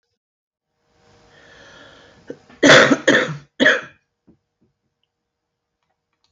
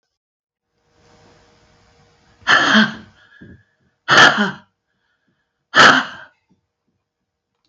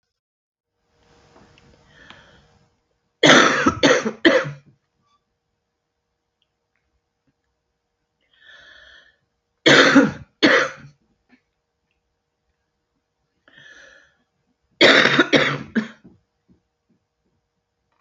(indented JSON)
{
  "cough_length": "6.3 s",
  "cough_amplitude": 31043,
  "cough_signal_mean_std_ratio": 0.28,
  "exhalation_length": "7.7 s",
  "exhalation_amplitude": 32767,
  "exhalation_signal_mean_std_ratio": 0.31,
  "three_cough_length": "18.0 s",
  "three_cough_amplitude": 32033,
  "three_cough_signal_mean_std_ratio": 0.29,
  "survey_phase": "alpha (2021-03-01 to 2021-08-12)",
  "age": "65+",
  "gender": "Female",
  "wearing_mask": "No",
  "symptom_cough_any": true,
  "symptom_onset": "4 days",
  "smoker_status": "Current smoker (e-cigarettes or vapes only)",
  "respiratory_condition_asthma": false,
  "respiratory_condition_other": false,
  "recruitment_source": "REACT",
  "submission_delay": "1 day",
  "covid_test_result": "Negative",
  "covid_test_method": "RT-qPCR"
}